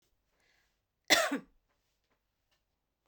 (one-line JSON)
{"cough_length": "3.1 s", "cough_amplitude": 11485, "cough_signal_mean_std_ratio": 0.22, "survey_phase": "beta (2021-08-13 to 2022-03-07)", "age": "45-64", "gender": "Female", "wearing_mask": "No", "symptom_none": true, "smoker_status": "Never smoked", "respiratory_condition_asthma": false, "respiratory_condition_other": false, "recruitment_source": "REACT", "submission_delay": "1 day", "covid_test_result": "Negative", "covid_test_method": "RT-qPCR"}